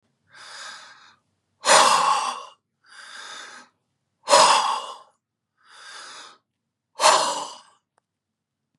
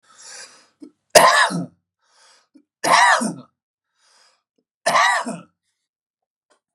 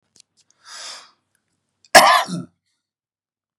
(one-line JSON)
{"exhalation_length": "8.8 s", "exhalation_amplitude": 29835, "exhalation_signal_mean_std_ratio": 0.36, "three_cough_length": "6.7 s", "three_cough_amplitude": 32768, "three_cough_signal_mean_std_ratio": 0.35, "cough_length": "3.6 s", "cough_amplitude": 32768, "cough_signal_mean_std_ratio": 0.24, "survey_phase": "beta (2021-08-13 to 2022-03-07)", "age": "45-64", "gender": "Male", "wearing_mask": "No", "symptom_cough_any": true, "smoker_status": "Never smoked", "respiratory_condition_asthma": false, "respiratory_condition_other": false, "recruitment_source": "REACT", "submission_delay": "1 day", "covid_test_result": "Negative", "covid_test_method": "RT-qPCR", "influenza_a_test_result": "Negative", "influenza_b_test_result": "Negative"}